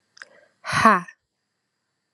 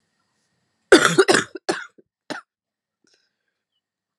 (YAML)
exhalation_length: 2.1 s
exhalation_amplitude: 31691
exhalation_signal_mean_std_ratio: 0.28
cough_length: 4.2 s
cough_amplitude: 32767
cough_signal_mean_std_ratio: 0.25
survey_phase: alpha (2021-03-01 to 2021-08-12)
age: 18-44
gender: Female
wearing_mask: 'No'
symptom_cough_any: true
symptom_change_to_sense_of_smell_or_taste: true
symptom_onset: 2 days
smoker_status: Never smoked
respiratory_condition_asthma: false
respiratory_condition_other: false
recruitment_source: Test and Trace
submission_delay: 2 days
covid_test_result: Positive
covid_test_method: RT-qPCR
covid_ct_value: 15.5
covid_ct_gene: ORF1ab gene
covid_ct_mean: 15.5
covid_viral_load: 8100000 copies/ml
covid_viral_load_category: High viral load (>1M copies/ml)